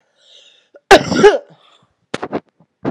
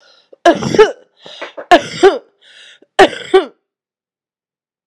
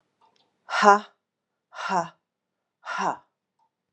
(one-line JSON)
{"cough_length": "2.9 s", "cough_amplitude": 32768, "cough_signal_mean_std_ratio": 0.32, "three_cough_length": "4.9 s", "three_cough_amplitude": 32768, "three_cough_signal_mean_std_ratio": 0.34, "exhalation_length": "3.9 s", "exhalation_amplitude": 28369, "exhalation_signal_mean_std_ratio": 0.28, "survey_phase": "beta (2021-08-13 to 2022-03-07)", "age": "45-64", "gender": "Female", "wearing_mask": "No", "symptom_cough_any": true, "symptom_runny_or_blocked_nose": true, "symptom_shortness_of_breath": true, "symptom_fatigue": true, "symptom_change_to_sense_of_smell_or_taste": true, "symptom_onset": "4 days", "smoker_status": "Ex-smoker", "respiratory_condition_asthma": false, "respiratory_condition_other": false, "recruitment_source": "Test and Trace", "submission_delay": "1 day", "covid_test_result": "Positive", "covid_test_method": "RT-qPCR", "covid_ct_value": 17.6, "covid_ct_gene": "N gene", "covid_ct_mean": 18.2, "covid_viral_load": "1000000 copies/ml", "covid_viral_load_category": "High viral load (>1M copies/ml)"}